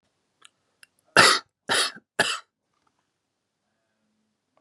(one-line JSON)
{"three_cough_length": "4.6 s", "three_cough_amplitude": 28474, "three_cough_signal_mean_std_ratio": 0.25, "survey_phase": "beta (2021-08-13 to 2022-03-07)", "age": "18-44", "gender": "Male", "wearing_mask": "No", "symptom_none": true, "smoker_status": "Current smoker (1 to 10 cigarettes per day)", "respiratory_condition_asthma": false, "respiratory_condition_other": false, "recruitment_source": "REACT", "submission_delay": "1 day", "covid_test_result": "Negative", "covid_test_method": "RT-qPCR", "influenza_a_test_result": "Negative", "influenza_b_test_result": "Negative"}